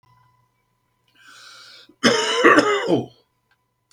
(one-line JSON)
{"cough_length": "3.9 s", "cough_amplitude": 27895, "cough_signal_mean_std_ratio": 0.39, "survey_phase": "beta (2021-08-13 to 2022-03-07)", "age": "65+", "gender": "Male", "wearing_mask": "No", "symptom_none": true, "smoker_status": "Never smoked", "respiratory_condition_asthma": false, "respiratory_condition_other": false, "recruitment_source": "REACT", "submission_delay": "3 days", "covid_test_result": "Negative", "covid_test_method": "RT-qPCR"}